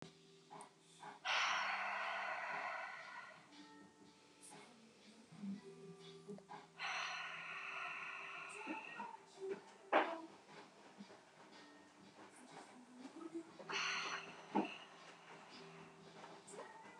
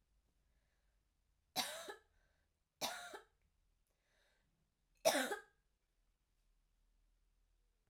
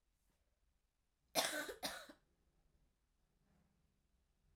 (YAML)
exhalation_length: 17.0 s
exhalation_amplitude: 2850
exhalation_signal_mean_std_ratio: 0.6
three_cough_length: 7.9 s
three_cough_amplitude: 3413
three_cough_signal_mean_std_ratio: 0.24
cough_length: 4.6 s
cough_amplitude: 2951
cough_signal_mean_std_ratio: 0.27
survey_phase: alpha (2021-03-01 to 2021-08-12)
age: 18-44
gender: Female
wearing_mask: 'No'
symptom_fatigue: true
symptom_fever_high_temperature: true
symptom_headache: true
symptom_onset: 7 days
smoker_status: Current smoker (1 to 10 cigarettes per day)
respiratory_condition_asthma: false
respiratory_condition_other: false
recruitment_source: Test and Trace
submission_delay: 2 days
covid_test_result: Positive
covid_test_method: RT-qPCR